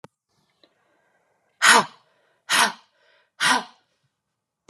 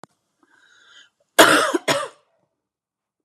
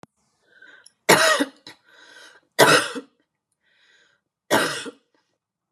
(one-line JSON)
{"exhalation_length": "4.7 s", "exhalation_amplitude": 31245, "exhalation_signal_mean_std_ratio": 0.28, "cough_length": "3.2 s", "cough_amplitude": 32768, "cough_signal_mean_std_ratio": 0.29, "three_cough_length": "5.7 s", "three_cough_amplitude": 32005, "three_cough_signal_mean_std_ratio": 0.32, "survey_phase": "beta (2021-08-13 to 2022-03-07)", "age": "18-44", "gender": "Female", "wearing_mask": "No", "symptom_none": true, "symptom_onset": "6 days", "smoker_status": "Never smoked", "respiratory_condition_asthma": true, "respiratory_condition_other": false, "recruitment_source": "REACT", "submission_delay": "1 day", "covid_test_result": "Negative", "covid_test_method": "RT-qPCR"}